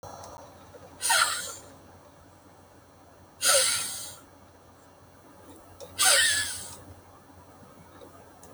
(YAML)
exhalation_length: 8.5 s
exhalation_amplitude: 13734
exhalation_signal_mean_std_ratio: 0.41
survey_phase: alpha (2021-03-01 to 2021-08-12)
age: 65+
gender: Female
wearing_mask: 'No'
symptom_cough_any: true
symptom_shortness_of_breath: true
symptom_abdominal_pain: true
smoker_status: Never smoked
respiratory_condition_asthma: false
respiratory_condition_other: false
recruitment_source: REACT
submission_delay: 2 days
covid_test_result: Negative
covid_test_method: RT-qPCR